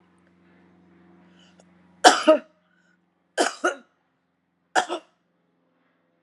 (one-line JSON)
{"three_cough_length": "6.2 s", "three_cough_amplitude": 32727, "three_cough_signal_mean_std_ratio": 0.23, "survey_phase": "beta (2021-08-13 to 2022-03-07)", "age": "65+", "gender": "Female", "wearing_mask": "No", "symptom_none": true, "symptom_onset": "12 days", "smoker_status": "Ex-smoker", "respiratory_condition_asthma": false, "respiratory_condition_other": false, "recruitment_source": "REACT", "submission_delay": "1 day", "covid_test_result": "Negative", "covid_test_method": "RT-qPCR"}